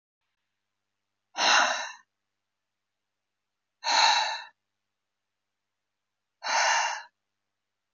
{
  "exhalation_length": "7.9 s",
  "exhalation_amplitude": 13455,
  "exhalation_signal_mean_std_ratio": 0.35,
  "survey_phase": "beta (2021-08-13 to 2022-03-07)",
  "age": "45-64",
  "gender": "Female",
  "wearing_mask": "No",
  "symptom_headache": true,
  "symptom_change_to_sense_of_smell_or_taste": true,
  "symptom_loss_of_taste": true,
  "smoker_status": "Ex-smoker",
  "respiratory_condition_asthma": false,
  "respiratory_condition_other": false,
  "recruitment_source": "REACT",
  "submission_delay": "1 day",
  "covid_test_result": "Negative",
  "covid_test_method": "RT-qPCR"
}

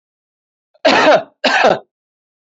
{
  "cough_length": "2.6 s",
  "cough_amplitude": 32028,
  "cough_signal_mean_std_ratio": 0.43,
  "survey_phase": "alpha (2021-03-01 to 2021-08-12)",
  "age": "45-64",
  "gender": "Male",
  "wearing_mask": "No",
  "symptom_none": true,
  "smoker_status": "Never smoked",
  "respiratory_condition_asthma": false,
  "respiratory_condition_other": false,
  "recruitment_source": "REACT",
  "submission_delay": "2 days",
  "covid_test_result": "Negative",
  "covid_test_method": "RT-qPCR"
}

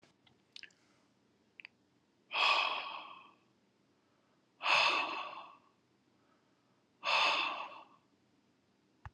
{
  "exhalation_length": "9.1 s",
  "exhalation_amplitude": 4975,
  "exhalation_signal_mean_std_ratio": 0.38,
  "survey_phase": "alpha (2021-03-01 to 2021-08-12)",
  "age": "45-64",
  "gender": "Male",
  "wearing_mask": "No",
  "symptom_none": true,
  "smoker_status": "Ex-smoker",
  "respiratory_condition_asthma": false,
  "respiratory_condition_other": false,
  "recruitment_source": "REACT",
  "submission_delay": "2 days",
  "covid_test_result": "Negative",
  "covid_test_method": "RT-qPCR"
}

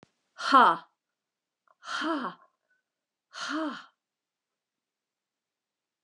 {
  "exhalation_length": "6.0 s",
  "exhalation_amplitude": 16774,
  "exhalation_signal_mean_std_ratio": 0.27,
  "survey_phase": "alpha (2021-03-01 to 2021-08-12)",
  "age": "65+",
  "gender": "Female",
  "wearing_mask": "No",
  "symptom_none": true,
  "smoker_status": "Never smoked",
  "respiratory_condition_asthma": false,
  "respiratory_condition_other": false,
  "recruitment_source": "REACT",
  "submission_delay": "1 day",
  "covid_test_result": "Negative",
  "covid_test_method": "RT-qPCR"
}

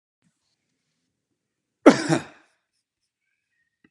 {
  "cough_length": "3.9 s",
  "cough_amplitude": 32554,
  "cough_signal_mean_std_ratio": 0.16,
  "survey_phase": "alpha (2021-03-01 to 2021-08-12)",
  "age": "45-64",
  "gender": "Male",
  "wearing_mask": "No",
  "symptom_none": true,
  "smoker_status": "Never smoked",
  "respiratory_condition_asthma": false,
  "respiratory_condition_other": false,
  "recruitment_source": "REACT",
  "submission_delay": "3 days",
  "covid_test_result": "Negative",
  "covid_test_method": "RT-qPCR"
}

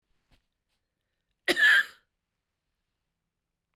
{
  "cough_length": "3.8 s",
  "cough_amplitude": 9891,
  "cough_signal_mean_std_ratio": 0.25,
  "survey_phase": "beta (2021-08-13 to 2022-03-07)",
  "age": "45-64",
  "gender": "Female",
  "wearing_mask": "No",
  "symptom_cough_any": true,
  "symptom_runny_or_blocked_nose": true,
  "symptom_fatigue": true,
  "symptom_other": true,
  "smoker_status": "Ex-smoker",
  "respiratory_condition_asthma": true,
  "respiratory_condition_other": false,
  "recruitment_source": "Test and Trace",
  "submission_delay": "1 day",
  "covid_test_result": "Positive",
  "covid_test_method": "LFT"
}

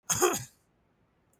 {
  "cough_length": "1.4 s",
  "cough_amplitude": 9045,
  "cough_signal_mean_std_ratio": 0.37,
  "survey_phase": "beta (2021-08-13 to 2022-03-07)",
  "age": "45-64",
  "gender": "Male",
  "wearing_mask": "No",
  "symptom_none": true,
  "smoker_status": "Never smoked",
  "respiratory_condition_asthma": false,
  "respiratory_condition_other": false,
  "recruitment_source": "REACT",
  "submission_delay": "1 day",
  "covid_test_result": "Negative",
  "covid_test_method": "RT-qPCR",
  "influenza_a_test_result": "Negative",
  "influenza_b_test_result": "Negative"
}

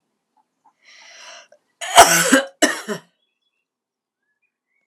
{
  "cough_length": "4.9 s",
  "cough_amplitude": 32768,
  "cough_signal_mean_std_ratio": 0.27,
  "survey_phase": "alpha (2021-03-01 to 2021-08-12)",
  "age": "45-64",
  "gender": "Female",
  "wearing_mask": "No",
  "symptom_shortness_of_breath": true,
  "symptom_headache": true,
  "symptom_onset": "12 days",
  "smoker_status": "Ex-smoker",
  "respiratory_condition_asthma": false,
  "respiratory_condition_other": false,
  "recruitment_source": "REACT",
  "submission_delay": "2 days",
  "covid_test_result": "Negative",
  "covid_test_method": "RT-qPCR"
}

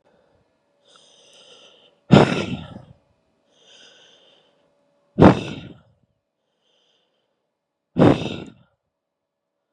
{
  "exhalation_length": "9.7 s",
  "exhalation_amplitude": 32768,
  "exhalation_signal_mean_std_ratio": 0.22,
  "survey_phase": "beta (2021-08-13 to 2022-03-07)",
  "age": "18-44",
  "gender": "Female",
  "wearing_mask": "No",
  "symptom_cough_any": true,
  "symptom_shortness_of_breath": true,
  "symptom_sore_throat": true,
  "symptom_abdominal_pain": true,
  "symptom_fatigue": true,
  "symptom_fever_high_temperature": true,
  "symptom_headache": true,
  "symptom_change_to_sense_of_smell_or_taste": true,
  "symptom_other": true,
  "symptom_onset": "2 days",
  "smoker_status": "Current smoker (1 to 10 cigarettes per day)",
  "respiratory_condition_asthma": false,
  "respiratory_condition_other": false,
  "recruitment_source": "Test and Trace",
  "submission_delay": "1 day",
  "covid_test_result": "Positive",
  "covid_test_method": "RT-qPCR",
  "covid_ct_value": 15.7,
  "covid_ct_gene": "ORF1ab gene"
}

